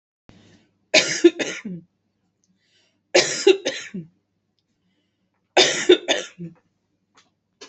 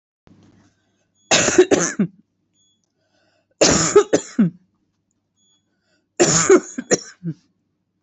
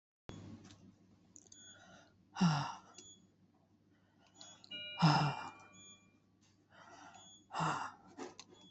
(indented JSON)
{
  "three_cough_length": "7.7 s",
  "three_cough_amplitude": 30335,
  "three_cough_signal_mean_std_ratio": 0.31,
  "cough_length": "8.0 s",
  "cough_amplitude": 31666,
  "cough_signal_mean_std_ratio": 0.36,
  "exhalation_length": "8.7 s",
  "exhalation_amplitude": 4866,
  "exhalation_signal_mean_std_ratio": 0.35,
  "survey_phase": "beta (2021-08-13 to 2022-03-07)",
  "age": "45-64",
  "gender": "Female",
  "wearing_mask": "No",
  "symptom_none": true,
  "smoker_status": "Never smoked",
  "respiratory_condition_asthma": false,
  "respiratory_condition_other": false,
  "recruitment_source": "REACT",
  "submission_delay": "1 day",
  "covid_test_result": "Negative",
  "covid_test_method": "RT-qPCR",
  "influenza_a_test_result": "Unknown/Void",
  "influenza_b_test_result": "Unknown/Void"
}